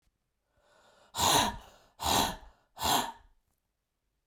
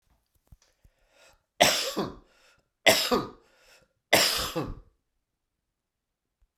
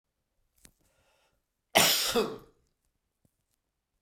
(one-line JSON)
{"exhalation_length": "4.3 s", "exhalation_amplitude": 7563, "exhalation_signal_mean_std_ratio": 0.4, "three_cough_length": "6.6 s", "three_cough_amplitude": 21734, "three_cough_signal_mean_std_ratio": 0.32, "cough_length": "4.0 s", "cough_amplitude": 16717, "cough_signal_mean_std_ratio": 0.28, "survey_phase": "beta (2021-08-13 to 2022-03-07)", "age": "45-64", "gender": "Male", "wearing_mask": "No", "symptom_cough_any": true, "symptom_runny_or_blocked_nose": true, "symptom_sore_throat": true, "symptom_headache": true, "smoker_status": "Never smoked", "respiratory_condition_asthma": true, "respiratory_condition_other": false, "recruitment_source": "Test and Trace", "submission_delay": "2 days", "covid_test_result": "Positive", "covid_test_method": "RT-qPCR", "covid_ct_value": 34.3, "covid_ct_gene": "N gene"}